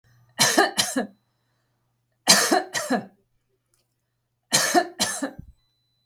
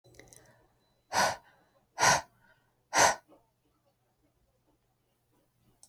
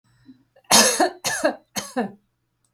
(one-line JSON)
{"three_cough_length": "6.1 s", "three_cough_amplitude": 31857, "three_cough_signal_mean_std_ratio": 0.4, "exhalation_length": "5.9 s", "exhalation_amplitude": 11293, "exhalation_signal_mean_std_ratio": 0.26, "cough_length": "2.7 s", "cough_amplitude": 30898, "cough_signal_mean_std_ratio": 0.42, "survey_phase": "beta (2021-08-13 to 2022-03-07)", "age": "45-64", "gender": "Female", "wearing_mask": "No", "symptom_none": true, "smoker_status": "Never smoked", "respiratory_condition_asthma": false, "respiratory_condition_other": false, "recruitment_source": "REACT", "submission_delay": "2 days", "covid_test_result": "Negative", "covid_test_method": "RT-qPCR", "influenza_a_test_result": "Unknown/Void", "influenza_b_test_result": "Unknown/Void"}